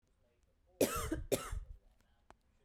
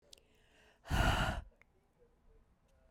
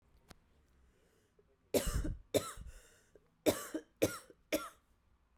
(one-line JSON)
{"cough_length": "2.6 s", "cough_amplitude": 3917, "cough_signal_mean_std_ratio": 0.4, "exhalation_length": "2.9 s", "exhalation_amplitude": 3486, "exhalation_signal_mean_std_ratio": 0.36, "three_cough_length": "5.4 s", "three_cough_amplitude": 5104, "three_cough_signal_mean_std_ratio": 0.34, "survey_phase": "beta (2021-08-13 to 2022-03-07)", "age": "18-44", "gender": "Female", "wearing_mask": "No", "symptom_cough_any": true, "symptom_runny_or_blocked_nose": true, "symptom_shortness_of_breath": true, "symptom_fatigue": true, "symptom_headache": true, "symptom_change_to_sense_of_smell_or_taste": true, "symptom_loss_of_taste": true, "smoker_status": "Never smoked", "respiratory_condition_asthma": true, "respiratory_condition_other": false, "recruitment_source": "Test and Trace", "submission_delay": "1 day", "covid_test_result": "Positive", "covid_test_method": "LFT"}